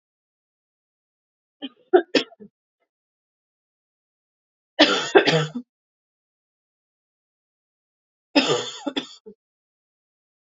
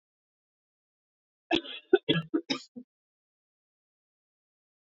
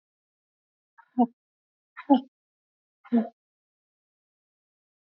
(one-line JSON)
{"three_cough_length": "10.5 s", "three_cough_amplitude": 30634, "three_cough_signal_mean_std_ratio": 0.24, "cough_length": "4.9 s", "cough_amplitude": 11675, "cough_signal_mean_std_ratio": 0.22, "exhalation_length": "5.0 s", "exhalation_amplitude": 15331, "exhalation_signal_mean_std_ratio": 0.19, "survey_phase": "beta (2021-08-13 to 2022-03-07)", "age": "18-44", "gender": "Female", "wearing_mask": "No", "symptom_cough_any": true, "symptom_runny_or_blocked_nose": true, "symptom_onset": "3 days", "smoker_status": "Ex-smoker", "respiratory_condition_asthma": false, "respiratory_condition_other": false, "recruitment_source": "Test and Trace", "submission_delay": "1 day", "covid_test_result": "Positive", "covid_test_method": "RT-qPCR", "covid_ct_value": 21.4, "covid_ct_gene": "ORF1ab gene", "covid_ct_mean": 21.6, "covid_viral_load": "79000 copies/ml", "covid_viral_load_category": "Low viral load (10K-1M copies/ml)"}